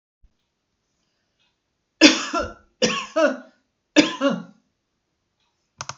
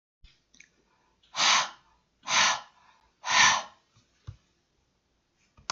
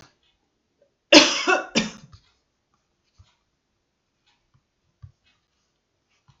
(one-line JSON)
{"three_cough_length": "6.0 s", "three_cough_amplitude": 32583, "three_cough_signal_mean_std_ratio": 0.3, "exhalation_length": "5.7 s", "exhalation_amplitude": 15526, "exhalation_signal_mean_std_ratio": 0.34, "cough_length": "6.4 s", "cough_amplitude": 32584, "cough_signal_mean_std_ratio": 0.2, "survey_phase": "beta (2021-08-13 to 2022-03-07)", "age": "65+", "gender": "Female", "wearing_mask": "No", "symptom_cough_any": true, "symptom_other": true, "smoker_status": "Never smoked", "respiratory_condition_asthma": false, "respiratory_condition_other": false, "recruitment_source": "REACT", "submission_delay": "2 days", "covid_test_result": "Negative", "covid_test_method": "RT-qPCR", "influenza_a_test_result": "Negative", "influenza_b_test_result": "Negative"}